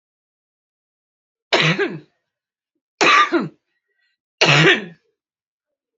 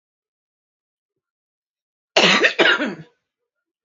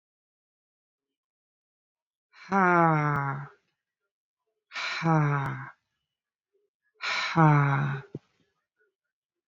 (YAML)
three_cough_length: 6.0 s
three_cough_amplitude: 31545
three_cough_signal_mean_std_ratio: 0.36
cough_length: 3.8 s
cough_amplitude: 32767
cough_signal_mean_std_ratio: 0.33
exhalation_length: 9.5 s
exhalation_amplitude: 13806
exhalation_signal_mean_std_ratio: 0.4
survey_phase: beta (2021-08-13 to 2022-03-07)
age: 45-64
gender: Female
wearing_mask: 'No'
symptom_none: true
smoker_status: Current smoker (1 to 10 cigarettes per day)
respiratory_condition_asthma: false
respiratory_condition_other: false
recruitment_source: REACT
submission_delay: 1 day
covid_test_result: Negative
covid_test_method: RT-qPCR
influenza_a_test_result: Negative
influenza_b_test_result: Negative